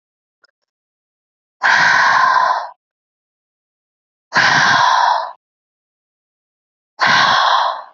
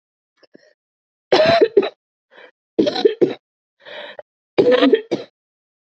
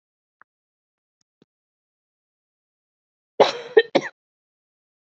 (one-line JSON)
{"exhalation_length": "7.9 s", "exhalation_amplitude": 28946, "exhalation_signal_mean_std_ratio": 0.52, "three_cough_length": "5.9 s", "three_cough_amplitude": 30895, "three_cough_signal_mean_std_ratio": 0.39, "cough_length": "5.0 s", "cough_amplitude": 27329, "cough_signal_mean_std_ratio": 0.16, "survey_phase": "alpha (2021-03-01 to 2021-08-12)", "age": "18-44", "gender": "Female", "wearing_mask": "No", "symptom_diarrhoea": true, "symptom_onset": "6 days", "smoker_status": "Current smoker (e-cigarettes or vapes only)", "respiratory_condition_asthma": false, "respiratory_condition_other": false, "recruitment_source": "REACT", "submission_delay": "0 days", "covid_test_result": "Negative", "covid_test_method": "RT-qPCR"}